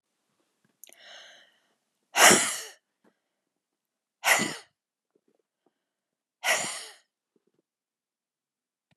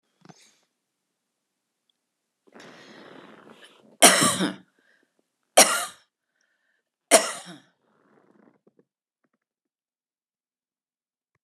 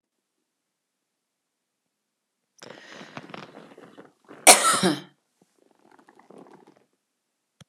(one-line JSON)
{"exhalation_length": "9.0 s", "exhalation_amplitude": 24973, "exhalation_signal_mean_std_ratio": 0.23, "three_cough_length": "11.4 s", "three_cough_amplitude": 32465, "three_cough_signal_mean_std_ratio": 0.2, "cough_length": "7.7 s", "cough_amplitude": 32768, "cough_signal_mean_std_ratio": 0.19, "survey_phase": "beta (2021-08-13 to 2022-03-07)", "age": "65+", "gender": "Female", "wearing_mask": "No", "symptom_none": true, "smoker_status": "Never smoked", "respiratory_condition_asthma": true, "respiratory_condition_other": false, "recruitment_source": "REACT", "submission_delay": "1 day", "covid_test_result": "Negative", "covid_test_method": "RT-qPCR"}